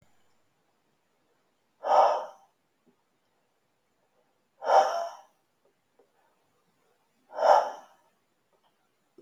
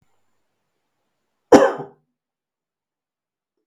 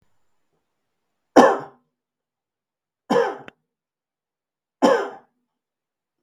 {"exhalation_length": "9.2 s", "exhalation_amplitude": 14595, "exhalation_signal_mean_std_ratio": 0.27, "cough_length": "3.7 s", "cough_amplitude": 32766, "cough_signal_mean_std_ratio": 0.18, "three_cough_length": "6.2 s", "three_cough_amplitude": 32766, "three_cough_signal_mean_std_ratio": 0.24, "survey_phase": "beta (2021-08-13 to 2022-03-07)", "age": "45-64", "gender": "Male", "wearing_mask": "No", "symptom_none": true, "smoker_status": "Never smoked", "respiratory_condition_asthma": false, "respiratory_condition_other": false, "recruitment_source": "REACT", "submission_delay": "1 day", "covid_test_result": "Negative", "covid_test_method": "RT-qPCR", "influenza_a_test_result": "Negative", "influenza_b_test_result": "Negative"}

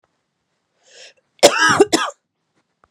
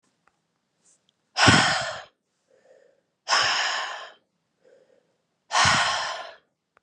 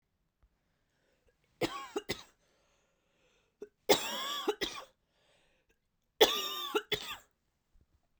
{"cough_length": "2.9 s", "cough_amplitude": 32768, "cough_signal_mean_std_ratio": 0.32, "exhalation_length": "6.8 s", "exhalation_amplitude": 23406, "exhalation_signal_mean_std_ratio": 0.41, "three_cough_length": "8.2 s", "three_cough_amplitude": 11809, "three_cough_signal_mean_std_ratio": 0.3, "survey_phase": "beta (2021-08-13 to 2022-03-07)", "age": "18-44", "gender": "Female", "wearing_mask": "No", "symptom_runny_or_blocked_nose": true, "symptom_shortness_of_breath": true, "symptom_abdominal_pain": true, "symptom_fever_high_temperature": true, "symptom_other": true, "symptom_onset": "7 days", "smoker_status": "Never smoked", "respiratory_condition_asthma": true, "respiratory_condition_other": false, "recruitment_source": "Test and Trace", "submission_delay": "2 days", "covid_test_result": "Positive", "covid_test_method": "RT-qPCR"}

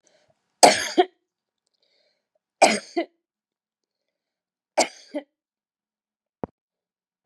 {"three_cough_length": "7.3 s", "three_cough_amplitude": 32768, "three_cough_signal_mean_std_ratio": 0.21, "survey_phase": "beta (2021-08-13 to 2022-03-07)", "age": "65+", "gender": "Female", "wearing_mask": "No", "symptom_none": true, "smoker_status": "Never smoked", "respiratory_condition_asthma": false, "respiratory_condition_other": false, "recruitment_source": "REACT", "submission_delay": "0 days", "covid_test_result": "Negative", "covid_test_method": "RT-qPCR", "influenza_a_test_result": "Negative", "influenza_b_test_result": "Negative"}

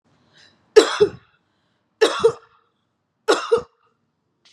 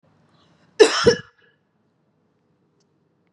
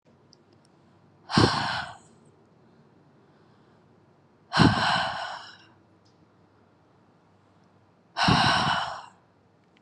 {"three_cough_length": "4.5 s", "three_cough_amplitude": 32768, "three_cough_signal_mean_std_ratio": 0.29, "cough_length": "3.3 s", "cough_amplitude": 32544, "cough_signal_mean_std_ratio": 0.22, "exhalation_length": "9.8 s", "exhalation_amplitude": 19615, "exhalation_signal_mean_std_ratio": 0.36, "survey_phase": "beta (2021-08-13 to 2022-03-07)", "age": "18-44", "gender": "Female", "wearing_mask": "No", "symptom_none": true, "smoker_status": "Never smoked", "respiratory_condition_asthma": false, "respiratory_condition_other": false, "recruitment_source": "REACT", "submission_delay": "1 day", "covid_test_result": "Negative", "covid_test_method": "RT-qPCR", "influenza_a_test_result": "Negative", "influenza_b_test_result": "Negative"}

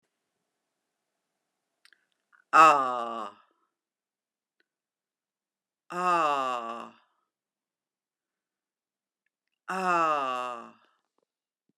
{"exhalation_length": "11.8 s", "exhalation_amplitude": 18495, "exhalation_signal_mean_std_ratio": 0.29, "survey_phase": "beta (2021-08-13 to 2022-03-07)", "age": "65+", "gender": "Female", "wearing_mask": "No", "symptom_runny_or_blocked_nose": true, "smoker_status": "Never smoked", "respiratory_condition_asthma": false, "respiratory_condition_other": false, "recruitment_source": "REACT", "submission_delay": "1 day", "covid_test_result": "Negative", "covid_test_method": "RT-qPCR", "influenza_a_test_result": "Negative", "influenza_b_test_result": "Negative"}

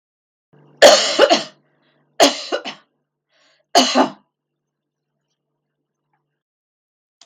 {"three_cough_length": "7.3 s", "three_cough_amplitude": 32768, "three_cough_signal_mean_std_ratio": 0.29, "survey_phase": "beta (2021-08-13 to 2022-03-07)", "age": "65+", "gender": "Female", "wearing_mask": "No", "symptom_none": true, "smoker_status": "Never smoked", "respiratory_condition_asthma": false, "respiratory_condition_other": false, "recruitment_source": "REACT", "submission_delay": "0 days", "covid_test_result": "Negative", "covid_test_method": "RT-qPCR"}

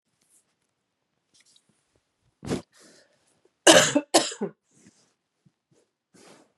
{"cough_length": "6.6 s", "cough_amplitude": 31739, "cough_signal_mean_std_ratio": 0.21, "survey_phase": "beta (2021-08-13 to 2022-03-07)", "age": "45-64", "gender": "Female", "wearing_mask": "No", "symptom_cough_any": true, "symptom_runny_or_blocked_nose": true, "symptom_shortness_of_breath": true, "symptom_sore_throat": true, "symptom_fatigue": true, "symptom_headache": true, "symptom_loss_of_taste": true, "symptom_onset": "4 days", "smoker_status": "Never smoked", "respiratory_condition_asthma": true, "respiratory_condition_other": false, "recruitment_source": "Test and Trace", "submission_delay": "1 day", "covid_test_result": "Positive", "covid_test_method": "ePCR"}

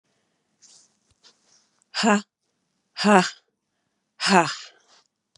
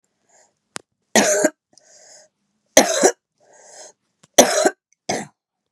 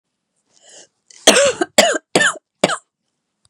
{"exhalation_length": "5.4 s", "exhalation_amplitude": 29143, "exhalation_signal_mean_std_ratio": 0.28, "three_cough_length": "5.7 s", "three_cough_amplitude": 32768, "three_cough_signal_mean_std_ratio": 0.32, "cough_length": "3.5 s", "cough_amplitude": 32768, "cough_signal_mean_std_ratio": 0.37, "survey_phase": "beta (2021-08-13 to 2022-03-07)", "age": "45-64", "gender": "Female", "wearing_mask": "No", "symptom_cough_any": true, "symptom_new_continuous_cough": true, "symptom_runny_or_blocked_nose": true, "symptom_fatigue": true, "symptom_headache": true, "symptom_change_to_sense_of_smell_or_taste": true, "symptom_onset": "2 days", "smoker_status": "Ex-smoker", "respiratory_condition_asthma": false, "respiratory_condition_other": false, "recruitment_source": "Test and Trace", "submission_delay": "1 day", "covid_test_result": "Positive", "covid_test_method": "RT-qPCR", "covid_ct_value": 27.8, "covid_ct_gene": "N gene"}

